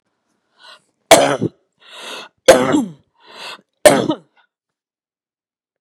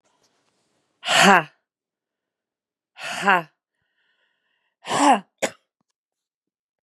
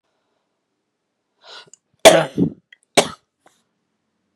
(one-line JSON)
{"three_cough_length": "5.8 s", "three_cough_amplitude": 32768, "three_cough_signal_mean_std_ratio": 0.31, "exhalation_length": "6.8 s", "exhalation_amplitude": 32767, "exhalation_signal_mean_std_ratio": 0.27, "cough_length": "4.4 s", "cough_amplitude": 32768, "cough_signal_mean_std_ratio": 0.22, "survey_phase": "beta (2021-08-13 to 2022-03-07)", "age": "45-64", "gender": "Female", "wearing_mask": "No", "symptom_cough_any": true, "symptom_shortness_of_breath": true, "symptom_fatigue": true, "symptom_headache": true, "smoker_status": "Ex-smoker", "respiratory_condition_asthma": false, "respiratory_condition_other": false, "recruitment_source": "REACT", "submission_delay": "13 days", "covid_test_result": "Negative", "covid_test_method": "RT-qPCR", "influenza_a_test_result": "Negative", "influenza_b_test_result": "Negative"}